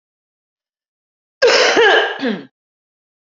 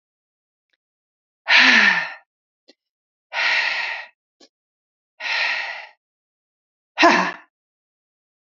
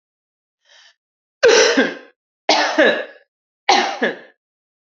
{"cough_length": "3.2 s", "cough_amplitude": 29182, "cough_signal_mean_std_ratio": 0.43, "exhalation_length": "8.5 s", "exhalation_amplitude": 32768, "exhalation_signal_mean_std_ratio": 0.36, "three_cough_length": "4.9 s", "three_cough_amplitude": 28973, "three_cough_signal_mean_std_ratio": 0.43, "survey_phase": "beta (2021-08-13 to 2022-03-07)", "age": "45-64", "gender": "Female", "wearing_mask": "No", "symptom_none": true, "symptom_onset": "4 days", "smoker_status": "Never smoked", "respiratory_condition_asthma": false, "respiratory_condition_other": false, "recruitment_source": "REACT", "submission_delay": "5 days", "covid_test_result": "Negative", "covid_test_method": "RT-qPCR", "influenza_a_test_result": "Negative", "influenza_b_test_result": "Negative"}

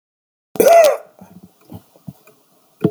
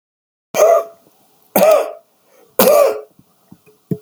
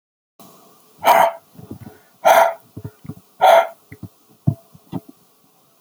{"cough_length": "2.9 s", "cough_amplitude": 32767, "cough_signal_mean_std_ratio": 0.34, "three_cough_length": "4.0 s", "three_cough_amplitude": 32768, "three_cough_signal_mean_std_ratio": 0.44, "exhalation_length": "5.8 s", "exhalation_amplitude": 29670, "exhalation_signal_mean_std_ratio": 0.34, "survey_phase": "beta (2021-08-13 to 2022-03-07)", "age": "65+", "gender": "Male", "wearing_mask": "No", "symptom_none": true, "smoker_status": "Ex-smoker", "respiratory_condition_asthma": false, "respiratory_condition_other": false, "recruitment_source": "REACT", "submission_delay": "8 days", "covid_test_result": "Negative", "covid_test_method": "RT-qPCR"}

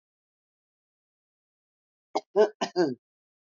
{"three_cough_length": "3.4 s", "three_cough_amplitude": 10546, "three_cough_signal_mean_std_ratio": 0.25, "survey_phase": "beta (2021-08-13 to 2022-03-07)", "age": "65+", "gender": "Female", "wearing_mask": "No", "symptom_none": true, "smoker_status": "Current smoker (1 to 10 cigarettes per day)", "respiratory_condition_asthma": false, "respiratory_condition_other": false, "recruitment_source": "REACT", "submission_delay": "1 day", "covid_test_result": "Negative", "covid_test_method": "RT-qPCR", "influenza_a_test_result": "Negative", "influenza_b_test_result": "Negative"}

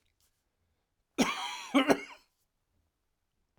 {"cough_length": "3.6 s", "cough_amplitude": 12395, "cough_signal_mean_std_ratio": 0.29, "survey_phase": "alpha (2021-03-01 to 2021-08-12)", "age": "45-64", "gender": "Male", "wearing_mask": "No", "symptom_cough_any": true, "smoker_status": "Never smoked", "respiratory_condition_asthma": false, "respiratory_condition_other": false, "recruitment_source": "Test and Trace", "submission_delay": "1 day", "covid_test_result": "Positive", "covid_test_method": "RT-qPCR", "covid_ct_value": 12.4, "covid_ct_gene": "ORF1ab gene", "covid_ct_mean": 13.5, "covid_viral_load": "37000000 copies/ml", "covid_viral_load_category": "High viral load (>1M copies/ml)"}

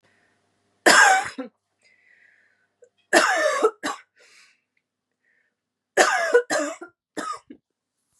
{"three_cough_length": "8.2 s", "three_cough_amplitude": 31694, "three_cough_signal_mean_std_ratio": 0.36, "survey_phase": "beta (2021-08-13 to 2022-03-07)", "age": "18-44", "gender": "Female", "wearing_mask": "No", "symptom_cough_any": true, "symptom_runny_or_blocked_nose": true, "symptom_shortness_of_breath": true, "symptom_sore_throat": true, "symptom_abdominal_pain": true, "symptom_fatigue": true, "symptom_headache": true, "symptom_change_to_sense_of_smell_or_taste": true, "symptom_loss_of_taste": true, "symptom_onset": "6 days", "smoker_status": "Never smoked", "respiratory_condition_asthma": false, "respiratory_condition_other": false, "recruitment_source": "Test and Trace", "submission_delay": "1 day", "covid_test_result": "Positive", "covid_test_method": "RT-qPCR", "covid_ct_value": 16.6, "covid_ct_gene": "ORF1ab gene", "covid_ct_mean": 17.1, "covid_viral_load": "2400000 copies/ml", "covid_viral_load_category": "High viral load (>1M copies/ml)"}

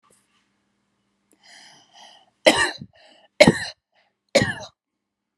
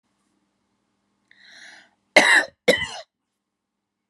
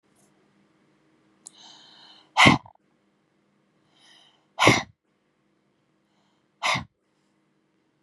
{"three_cough_length": "5.4 s", "three_cough_amplitude": 32768, "three_cough_signal_mean_std_ratio": 0.24, "cough_length": "4.1 s", "cough_amplitude": 30422, "cough_signal_mean_std_ratio": 0.26, "exhalation_length": "8.0 s", "exhalation_amplitude": 29650, "exhalation_signal_mean_std_ratio": 0.21, "survey_phase": "alpha (2021-03-01 to 2021-08-12)", "age": "45-64", "gender": "Female", "wearing_mask": "No", "symptom_none": true, "smoker_status": "Never smoked", "respiratory_condition_asthma": true, "respiratory_condition_other": false, "recruitment_source": "REACT", "submission_delay": "2 days", "covid_test_result": "Negative", "covid_test_method": "RT-qPCR"}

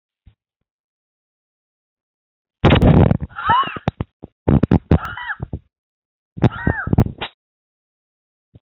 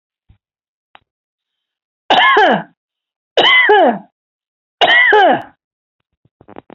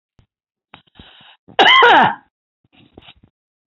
{"exhalation_length": "8.6 s", "exhalation_amplitude": 32768, "exhalation_signal_mean_std_ratio": 0.34, "three_cough_length": "6.7 s", "three_cough_amplitude": 30724, "three_cough_signal_mean_std_ratio": 0.45, "cough_length": "3.7 s", "cough_amplitude": 28916, "cough_signal_mean_std_ratio": 0.33, "survey_phase": "beta (2021-08-13 to 2022-03-07)", "age": "65+", "gender": "Female", "wearing_mask": "No", "symptom_none": true, "smoker_status": "Never smoked", "respiratory_condition_asthma": false, "respiratory_condition_other": false, "recruitment_source": "REACT", "submission_delay": "1 day", "covid_test_result": "Negative", "covid_test_method": "RT-qPCR", "influenza_a_test_result": "Negative", "influenza_b_test_result": "Negative"}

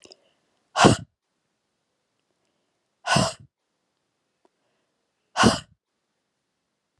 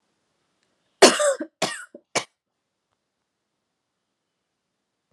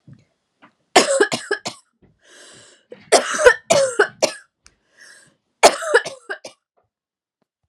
{"exhalation_length": "7.0 s", "exhalation_amplitude": 32767, "exhalation_signal_mean_std_ratio": 0.22, "cough_length": "5.1 s", "cough_amplitude": 32767, "cough_signal_mean_std_ratio": 0.21, "three_cough_length": "7.7 s", "three_cough_amplitude": 32768, "three_cough_signal_mean_std_ratio": 0.33, "survey_phase": "beta (2021-08-13 to 2022-03-07)", "age": "18-44", "gender": "Female", "wearing_mask": "No", "symptom_fatigue": true, "smoker_status": "Never smoked", "respiratory_condition_asthma": false, "respiratory_condition_other": false, "recruitment_source": "REACT", "submission_delay": "1 day", "covid_test_result": "Negative", "covid_test_method": "RT-qPCR", "influenza_a_test_result": "Negative", "influenza_b_test_result": "Negative"}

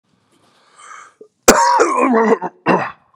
{"cough_length": "3.2 s", "cough_amplitude": 32768, "cough_signal_mean_std_ratio": 0.51, "survey_phase": "beta (2021-08-13 to 2022-03-07)", "age": "45-64", "gender": "Male", "wearing_mask": "No", "symptom_cough_any": true, "symptom_runny_or_blocked_nose": true, "symptom_shortness_of_breath": true, "symptom_fatigue": true, "symptom_onset": "3 days", "smoker_status": "Never smoked", "respiratory_condition_asthma": true, "respiratory_condition_other": false, "recruitment_source": "Test and Trace", "submission_delay": "1 day", "covid_test_result": "Positive", "covid_test_method": "RT-qPCR", "covid_ct_value": 19.5, "covid_ct_gene": "ORF1ab gene", "covid_ct_mean": 19.6, "covid_viral_load": "360000 copies/ml", "covid_viral_load_category": "Low viral load (10K-1M copies/ml)"}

